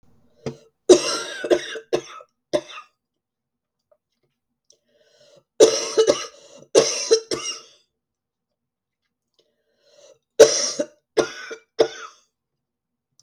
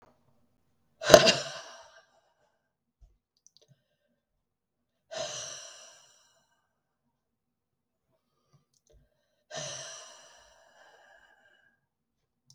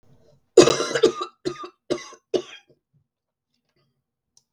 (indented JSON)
{
  "three_cough_length": "13.2 s",
  "three_cough_amplitude": 32768,
  "three_cough_signal_mean_std_ratio": 0.29,
  "exhalation_length": "12.5 s",
  "exhalation_amplitude": 32768,
  "exhalation_signal_mean_std_ratio": 0.15,
  "cough_length": "4.5 s",
  "cough_amplitude": 32768,
  "cough_signal_mean_std_ratio": 0.26,
  "survey_phase": "beta (2021-08-13 to 2022-03-07)",
  "age": "45-64",
  "gender": "Female",
  "wearing_mask": "No",
  "symptom_cough_any": true,
  "symptom_runny_or_blocked_nose": true,
  "symptom_shortness_of_breath": true,
  "symptom_sore_throat": true,
  "symptom_fatigue": true,
  "symptom_fever_high_temperature": true,
  "symptom_headache": true,
  "smoker_status": "Never smoked",
  "respiratory_condition_asthma": false,
  "respiratory_condition_other": false,
  "recruitment_source": "Test and Trace",
  "submission_delay": "2 days",
  "covid_test_result": "Positive",
  "covid_test_method": "LFT"
}